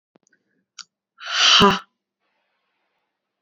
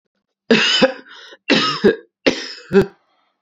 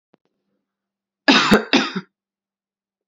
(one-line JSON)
{"exhalation_length": "3.4 s", "exhalation_amplitude": 29652, "exhalation_signal_mean_std_ratio": 0.3, "three_cough_length": "3.4 s", "three_cough_amplitude": 30323, "three_cough_signal_mean_std_ratio": 0.46, "cough_length": "3.1 s", "cough_amplitude": 31201, "cough_signal_mean_std_ratio": 0.32, "survey_phase": "beta (2021-08-13 to 2022-03-07)", "age": "18-44", "gender": "Female", "wearing_mask": "No", "symptom_runny_or_blocked_nose": true, "symptom_fatigue": true, "smoker_status": "Never smoked", "respiratory_condition_asthma": false, "respiratory_condition_other": false, "recruitment_source": "Test and Trace", "submission_delay": "2 days", "covid_test_result": "Positive", "covid_test_method": "ePCR"}